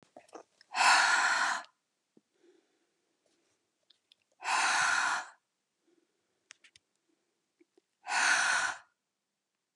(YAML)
exhalation_length: 9.8 s
exhalation_amplitude: 8693
exhalation_signal_mean_std_ratio: 0.4
survey_phase: beta (2021-08-13 to 2022-03-07)
age: 65+
gender: Female
wearing_mask: 'No'
symptom_none: true
symptom_onset: 12 days
smoker_status: Ex-smoker
respiratory_condition_asthma: false
respiratory_condition_other: false
recruitment_source: REACT
submission_delay: 1 day
covid_test_result: Negative
covid_test_method: RT-qPCR